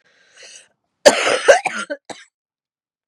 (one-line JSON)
{"cough_length": "3.1 s", "cough_amplitude": 32768, "cough_signal_mean_std_ratio": 0.31, "survey_phase": "beta (2021-08-13 to 2022-03-07)", "age": "18-44", "gender": "Female", "wearing_mask": "No", "symptom_cough_any": true, "symptom_shortness_of_breath": true, "symptom_diarrhoea": true, "symptom_fatigue": true, "symptom_other": true, "symptom_onset": "3 days", "smoker_status": "Never smoked", "respiratory_condition_asthma": false, "respiratory_condition_other": false, "recruitment_source": "Test and Trace", "submission_delay": "2 days", "covid_test_result": "Positive", "covid_test_method": "RT-qPCR", "covid_ct_value": 19.1, "covid_ct_gene": "ORF1ab gene", "covid_ct_mean": 19.8, "covid_viral_load": "330000 copies/ml", "covid_viral_load_category": "Low viral load (10K-1M copies/ml)"}